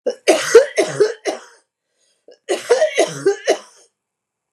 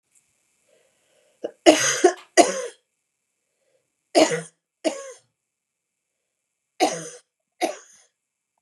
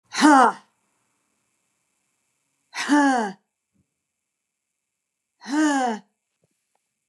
{
  "cough_length": "4.5 s",
  "cough_amplitude": 32768,
  "cough_signal_mean_std_ratio": 0.44,
  "three_cough_length": "8.6 s",
  "three_cough_amplitude": 32705,
  "three_cough_signal_mean_std_ratio": 0.27,
  "exhalation_length": "7.1 s",
  "exhalation_amplitude": 26981,
  "exhalation_signal_mean_std_ratio": 0.32,
  "survey_phase": "beta (2021-08-13 to 2022-03-07)",
  "age": "45-64",
  "gender": "Female",
  "wearing_mask": "No",
  "symptom_cough_any": true,
  "symptom_runny_or_blocked_nose": true,
  "symptom_sore_throat": true,
  "symptom_fatigue": true,
  "symptom_headache": true,
  "symptom_onset": "5 days",
  "smoker_status": "Never smoked",
  "respiratory_condition_asthma": false,
  "respiratory_condition_other": false,
  "recruitment_source": "Test and Trace",
  "submission_delay": "1 day",
  "covid_test_result": "Negative",
  "covid_test_method": "ePCR"
}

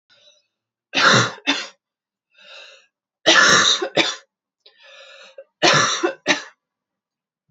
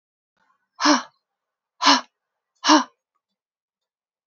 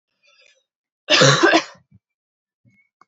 {
  "three_cough_length": "7.5 s",
  "three_cough_amplitude": 31150,
  "three_cough_signal_mean_std_ratio": 0.4,
  "exhalation_length": "4.3 s",
  "exhalation_amplitude": 27348,
  "exhalation_signal_mean_std_ratio": 0.27,
  "cough_length": "3.1 s",
  "cough_amplitude": 29212,
  "cough_signal_mean_std_ratio": 0.33,
  "survey_phase": "alpha (2021-03-01 to 2021-08-12)",
  "age": "18-44",
  "gender": "Female",
  "wearing_mask": "No",
  "symptom_fatigue": true,
  "symptom_headache": true,
  "smoker_status": "Never smoked",
  "respiratory_condition_asthma": false,
  "respiratory_condition_other": false,
  "recruitment_source": "Test and Trace",
  "submission_delay": "2 days",
  "covid_test_result": "Positive",
  "covid_test_method": "RT-qPCR"
}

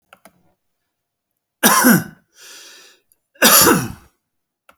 {
  "cough_length": "4.8 s",
  "cough_amplitude": 32472,
  "cough_signal_mean_std_ratio": 0.35,
  "survey_phase": "beta (2021-08-13 to 2022-03-07)",
  "age": "65+",
  "gender": "Male",
  "wearing_mask": "No",
  "symptom_none": true,
  "smoker_status": "Never smoked",
  "respiratory_condition_asthma": false,
  "respiratory_condition_other": false,
  "recruitment_source": "REACT",
  "submission_delay": "1 day",
  "covid_test_result": "Negative",
  "covid_test_method": "RT-qPCR"
}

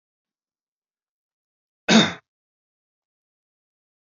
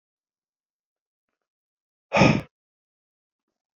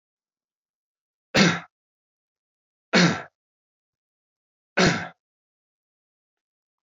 {
  "cough_length": "4.1 s",
  "cough_amplitude": 25973,
  "cough_signal_mean_std_ratio": 0.18,
  "exhalation_length": "3.8 s",
  "exhalation_amplitude": 20777,
  "exhalation_signal_mean_std_ratio": 0.2,
  "three_cough_length": "6.8 s",
  "three_cough_amplitude": 19426,
  "three_cough_signal_mean_std_ratio": 0.25,
  "survey_phase": "beta (2021-08-13 to 2022-03-07)",
  "age": "18-44",
  "gender": "Male",
  "wearing_mask": "No",
  "symptom_fatigue": true,
  "symptom_onset": "2 days",
  "smoker_status": "Ex-smoker",
  "respiratory_condition_asthma": false,
  "respiratory_condition_other": false,
  "recruitment_source": "Test and Trace",
  "submission_delay": "2 days",
  "covid_test_result": "Positive",
  "covid_test_method": "RT-qPCR",
  "covid_ct_value": 29.4,
  "covid_ct_gene": "ORF1ab gene"
}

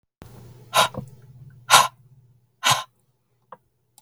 {
  "exhalation_length": "4.0 s",
  "exhalation_amplitude": 32768,
  "exhalation_signal_mean_std_ratio": 0.29,
  "survey_phase": "beta (2021-08-13 to 2022-03-07)",
  "age": "45-64",
  "gender": "Female",
  "wearing_mask": "No",
  "symptom_abdominal_pain": true,
  "smoker_status": "Never smoked",
  "respiratory_condition_asthma": true,
  "respiratory_condition_other": false,
  "recruitment_source": "REACT",
  "submission_delay": "2 days",
  "covid_test_result": "Negative",
  "covid_test_method": "RT-qPCR",
  "influenza_a_test_result": "Negative",
  "influenza_b_test_result": "Negative"
}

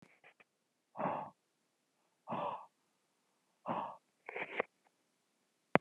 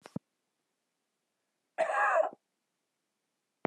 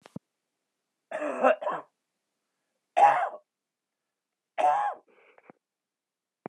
{
  "exhalation_length": "5.8 s",
  "exhalation_amplitude": 15444,
  "exhalation_signal_mean_std_ratio": 0.28,
  "cough_length": "3.7 s",
  "cough_amplitude": 6672,
  "cough_signal_mean_std_ratio": 0.31,
  "three_cough_length": "6.5 s",
  "three_cough_amplitude": 14176,
  "three_cough_signal_mean_std_ratio": 0.32,
  "survey_phase": "alpha (2021-03-01 to 2021-08-12)",
  "age": "45-64",
  "gender": "Male",
  "wearing_mask": "No",
  "symptom_none": true,
  "symptom_onset": "9 days",
  "smoker_status": "Never smoked",
  "respiratory_condition_asthma": false,
  "respiratory_condition_other": false,
  "recruitment_source": "REACT",
  "submission_delay": "3 days",
  "covid_test_result": "Negative",
  "covid_test_method": "RT-qPCR"
}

